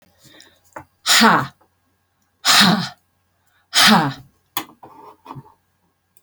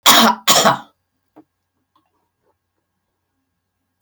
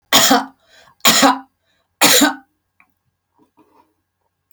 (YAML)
exhalation_length: 6.2 s
exhalation_amplitude: 32767
exhalation_signal_mean_std_ratio: 0.37
cough_length: 4.0 s
cough_amplitude: 32768
cough_signal_mean_std_ratio: 0.3
three_cough_length: 4.5 s
three_cough_amplitude: 32768
three_cough_signal_mean_std_ratio: 0.38
survey_phase: beta (2021-08-13 to 2022-03-07)
age: 65+
gender: Female
wearing_mask: 'No'
symptom_none: true
smoker_status: Never smoked
respiratory_condition_asthma: false
respiratory_condition_other: false
recruitment_source: REACT
submission_delay: 0 days
covid_test_result: Negative
covid_test_method: RT-qPCR